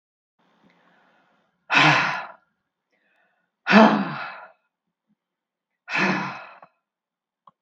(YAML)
exhalation_length: 7.6 s
exhalation_amplitude: 32767
exhalation_signal_mean_std_ratio: 0.31
survey_phase: beta (2021-08-13 to 2022-03-07)
age: 65+
gender: Female
wearing_mask: 'No'
symptom_none: true
smoker_status: Ex-smoker
respiratory_condition_asthma: false
respiratory_condition_other: false
recruitment_source: REACT
submission_delay: 1 day
covid_test_result: Negative
covid_test_method: RT-qPCR
influenza_a_test_result: Negative
influenza_b_test_result: Negative